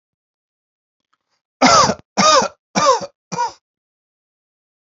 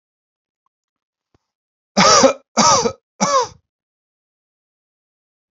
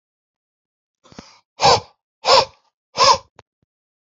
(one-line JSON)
{"cough_length": "4.9 s", "cough_amplitude": 32768, "cough_signal_mean_std_ratio": 0.36, "three_cough_length": "5.5 s", "three_cough_amplitude": 30820, "three_cough_signal_mean_std_ratio": 0.33, "exhalation_length": "4.1 s", "exhalation_amplitude": 29201, "exhalation_signal_mean_std_ratio": 0.3, "survey_phase": "alpha (2021-03-01 to 2021-08-12)", "age": "18-44", "gender": "Male", "wearing_mask": "No", "symptom_none": true, "smoker_status": "Ex-smoker", "respiratory_condition_asthma": false, "respiratory_condition_other": false, "recruitment_source": "REACT", "submission_delay": "1 day", "covid_test_result": "Negative", "covid_test_method": "RT-qPCR"}